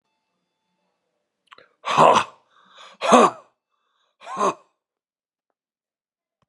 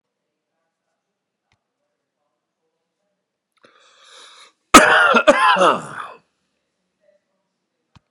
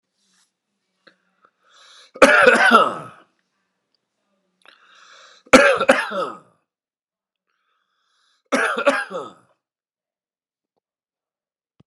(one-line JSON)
{"exhalation_length": "6.5 s", "exhalation_amplitude": 32767, "exhalation_signal_mean_std_ratio": 0.26, "cough_length": "8.1 s", "cough_amplitude": 32768, "cough_signal_mean_std_ratio": 0.27, "three_cough_length": "11.9 s", "three_cough_amplitude": 32768, "three_cough_signal_mean_std_ratio": 0.29, "survey_phase": "beta (2021-08-13 to 2022-03-07)", "age": "65+", "gender": "Male", "wearing_mask": "No", "symptom_none": true, "smoker_status": "Never smoked", "respiratory_condition_asthma": false, "respiratory_condition_other": false, "recruitment_source": "REACT", "submission_delay": "1 day", "covid_test_result": "Negative", "covid_test_method": "RT-qPCR"}